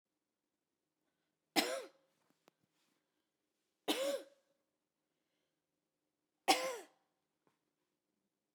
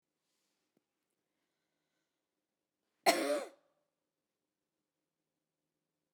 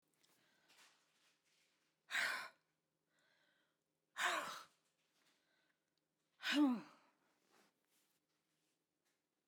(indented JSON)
{
  "three_cough_length": "8.5 s",
  "three_cough_amplitude": 5718,
  "three_cough_signal_mean_std_ratio": 0.23,
  "cough_length": "6.1 s",
  "cough_amplitude": 7794,
  "cough_signal_mean_std_ratio": 0.18,
  "exhalation_length": "9.5 s",
  "exhalation_amplitude": 1477,
  "exhalation_signal_mean_std_ratio": 0.27,
  "survey_phase": "beta (2021-08-13 to 2022-03-07)",
  "age": "45-64",
  "gender": "Female",
  "wearing_mask": "No",
  "symptom_none": true,
  "smoker_status": "Never smoked",
  "respiratory_condition_asthma": false,
  "respiratory_condition_other": false,
  "recruitment_source": "REACT",
  "submission_delay": "2 days",
  "covid_test_result": "Negative",
  "covid_test_method": "RT-qPCR",
  "influenza_a_test_result": "Negative",
  "influenza_b_test_result": "Negative"
}